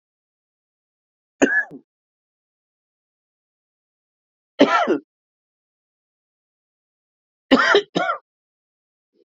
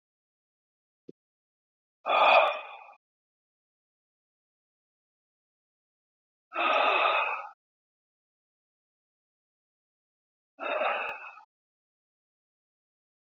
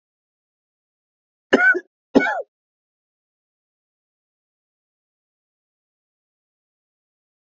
{"three_cough_length": "9.4 s", "three_cough_amplitude": 29557, "three_cough_signal_mean_std_ratio": 0.25, "exhalation_length": "13.4 s", "exhalation_amplitude": 15123, "exhalation_signal_mean_std_ratio": 0.29, "cough_length": "7.6 s", "cough_amplitude": 31244, "cough_signal_mean_std_ratio": 0.19, "survey_phase": "beta (2021-08-13 to 2022-03-07)", "age": "65+", "gender": "Male", "wearing_mask": "No", "symptom_cough_any": true, "symptom_runny_or_blocked_nose": true, "symptom_shortness_of_breath": true, "symptom_fatigue": true, "symptom_fever_high_temperature": true, "symptom_headache": true, "symptom_onset": "4 days", "smoker_status": "Never smoked", "respiratory_condition_asthma": false, "respiratory_condition_other": false, "recruitment_source": "Test and Trace", "submission_delay": "1 day", "covid_test_result": "Positive", "covid_test_method": "RT-qPCR", "covid_ct_value": 15.3, "covid_ct_gene": "ORF1ab gene", "covid_ct_mean": 15.7, "covid_viral_load": "7000000 copies/ml", "covid_viral_load_category": "High viral load (>1M copies/ml)"}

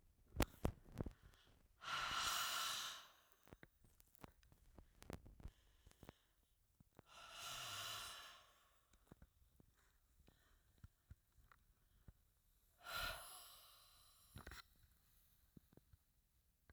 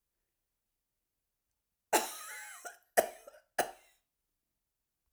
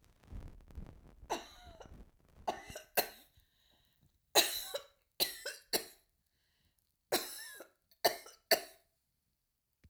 {"exhalation_length": "16.7 s", "exhalation_amplitude": 4622, "exhalation_signal_mean_std_ratio": 0.39, "cough_length": "5.1 s", "cough_amplitude": 9163, "cough_signal_mean_std_ratio": 0.22, "three_cough_length": "9.9 s", "three_cough_amplitude": 9766, "three_cough_signal_mean_std_ratio": 0.29, "survey_phase": "alpha (2021-03-01 to 2021-08-12)", "age": "65+", "gender": "Female", "wearing_mask": "No", "symptom_none": true, "smoker_status": "Never smoked", "respiratory_condition_asthma": false, "respiratory_condition_other": false, "recruitment_source": "REACT", "submission_delay": "1 day", "covid_test_result": "Negative", "covid_test_method": "RT-qPCR"}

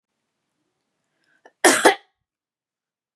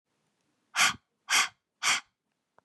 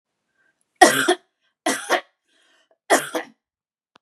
{"cough_length": "3.2 s", "cough_amplitude": 32767, "cough_signal_mean_std_ratio": 0.22, "exhalation_length": "2.6 s", "exhalation_amplitude": 9414, "exhalation_signal_mean_std_ratio": 0.35, "three_cough_length": "4.0 s", "three_cough_amplitude": 32768, "three_cough_signal_mean_std_ratio": 0.3, "survey_phase": "beta (2021-08-13 to 2022-03-07)", "age": "18-44", "gender": "Female", "wearing_mask": "No", "symptom_none": true, "smoker_status": "Never smoked", "respiratory_condition_asthma": false, "respiratory_condition_other": false, "recruitment_source": "REACT", "submission_delay": "1 day", "covid_test_result": "Negative", "covid_test_method": "RT-qPCR"}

